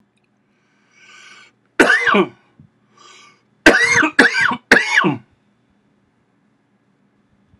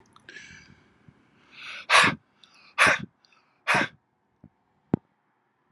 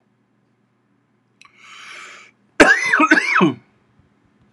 {
  "three_cough_length": "7.6 s",
  "three_cough_amplitude": 32768,
  "three_cough_signal_mean_std_ratio": 0.37,
  "exhalation_length": "5.7 s",
  "exhalation_amplitude": 20132,
  "exhalation_signal_mean_std_ratio": 0.28,
  "cough_length": "4.5 s",
  "cough_amplitude": 32768,
  "cough_signal_mean_std_ratio": 0.36,
  "survey_phase": "beta (2021-08-13 to 2022-03-07)",
  "age": "45-64",
  "gender": "Male",
  "wearing_mask": "No",
  "symptom_runny_or_blocked_nose": true,
  "smoker_status": "Never smoked",
  "respiratory_condition_asthma": false,
  "respiratory_condition_other": false,
  "recruitment_source": "Test and Trace",
  "submission_delay": "2 days",
  "covid_test_result": "Positive",
  "covid_test_method": "RT-qPCR",
  "covid_ct_value": 23.5,
  "covid_ct_gene": "ORF1ab gene",
  "covid_ct_mean": 23.7,
  "covid_viral_load": "17000 copies/ml",
  "covid_viral_load_category": "Low viral load (10K-1M copies/ml)"
}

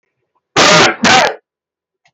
{
  "cough_length": "2.1 s",
  "cough_amplitude": 32768,
  "cough_signal_mean_std_ratio": 0.52,
  "survey_phase": "beta (2021-08-13 to 2022-03-07)",
  "age": "65+",
  "gender": "Male",
  "wearing_mask": "No",
  "symptom_none": true,
  "smoker_status": "Never smoked",
  "respiratory_condition_asthma": false,
  "respiratory_condition_other": false,
  "recruitment_source": "REACT",
  "submission_delay": "4 days",
  "covid_test_result": "Negative",
  "covid_test_method": "RT-qPCR"
}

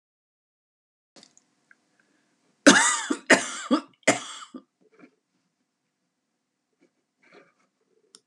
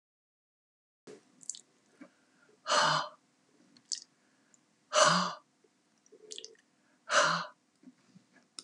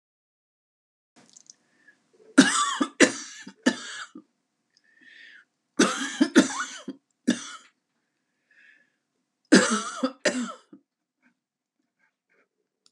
{
  "cough_length": "8.3 s",
  "cough_amplitude": 29186,
  "cough_signal_mean_std_ratio": 0.22,
  "exhalation_length": "8.6 s",
  "exhalation_amplitude": 9171,
  "exhalation_signal_mean_std_ratio": 0.3,
  "three_cough_length": "12.9 s",
  "three_cough_amplitude": 28123,
  "three_cough_signal_mean_std_ratio": 0.29,
  "survey_phase": "beta (2021-08-13 to 2022-03-07)",
  "age": "65+",
  "gender": "Female",
  "wearing_mask": "No",
  "symptom_none": true,
  "smoker_status": "Ex-smoker",
  "respiratory_condition_asthma": false,
  "respiratory_condition_other": false,
  "recruitment_source": "REACT",
  "submission_delay": "2 days",
  "covid_test_result": "Negative",
  "covid_test_method": "RT-qPCR",
  "influenza_a_test_result": "Unknown/Void",
  "influenza_b_test_result": "Unknown/Void"
}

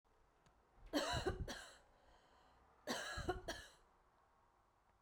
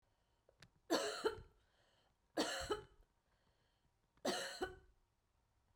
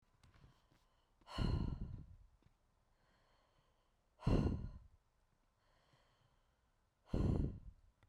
{
  "cough_length": "5.0 s",
  "cough_amplitude": 1496,
  "cough_signal_mean_std_ratio": 0.45,
  "three_cough_length": "5.8 s",
  "three_cough_amplitude": 2398,
  "three_cough_signal_mean_std_ratio": 0.38,
  "exhalation_length": "8.1 s",
  "exhalation_amplitude": 2425,
  "exhalation_signal_mean_std_ratio": 0.36,
  "survey_phase": "beta (2021-08-13 to 2022-03-07)",
  "age": "18-44",
  "gender": "Female",
  "wearing_mask": "No",
  "symptom_none": true,
  "smoker_status": "Never smoked",
  "respiratory_condition_asthma": false,
  "respiratory_condition_other": false,
  "recruitment_source": "REACT",
  "submission_delay": "1 day",
  "covid_test_result": "Negative",
  "covid_test_method": "RT-qPCR"
}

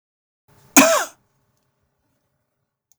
{
  "cough_length": "3.0 s",
  "cough_amplitude": 32768,
  "cough_signal_mean_std_ratio": 0.23,
  "survey_phase": "beta (2021-08-13 to 2022-03-07)",
  "age": "45-64",
  "gender": "Male",
  "wearing_mask": "No",
  "symptom_none": true,
  "smoker_status": "Never smoked",
  "respiratory_condition_asthma": false,
  "respiratory_condition_other": false,
  "recruitment_source": "REACT",
  "submission_delay": "2 days",
  "covid_test_result": "Negative",
  "covid_test_method": "RT-qPCR",
  "influenza_a_test_result": "Negative",
  "influenza_b_test_result": "Negative"
}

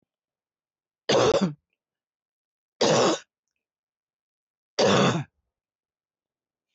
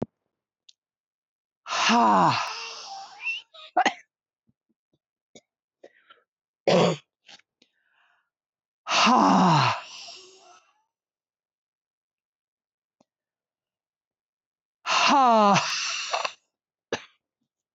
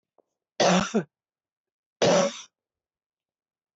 {
  "three_cough_length": "6.7 s",
  "three_cough_amplitude": 14119,
  "three_cough_signal_mean_std_ratio": 0.35,
  "exhalation_length": "17.7 s",
  "exhalation_amplitude": 14054,
  "exhalation_signal_mean_std_ratio": 0.37,
  "cough_length": "3.8 s",
  "cough_amplitude": 13639,
  "cough_signal_mean_std_ratio": 0.34,
  "survey_phase": "beta (2021-08-13 to 2022-03-07)",
  "age": "45-64",
  "gender": "Female",
  "wearing_mask": "No",
  "symptom_none": true,
  "smoker_status": "Never smoked",
  "respiratory_condition_asthma": false,
  "respiratory_condition_other": false,
  "recruitment_source": "REACT",
  "submission_delay": "2 days",
  "covid_test_result": "Negative",
  "covid_test_method": "RT-qPCR",
  "influenza_a_test_result": "Negative",
  "influenza_b_test_result": "Negative"
}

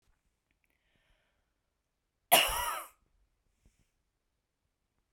{
  "cough_length": "5.1 s",
  "cough_amplitude": 12757,
  "cough_signal_mean_std_ratio": 0.21,
  "survey_phase": "beta (2021-08-13 to 2022-03-07)",
  "age": "45-64",
  "gender": "Female",
  "wearing_mask": "No",
  "symptom_none": true,
  "smoker_status": "Never smoked",
  "respiratory_condition_asthma": false,
  "respiratory_condition_other": false,
  "recruitment_source": "REACT",
  "submission_delay": "1 day",
  "covid_test_result": "Negative",
  "covid_test_method": "RT-qPCR"
}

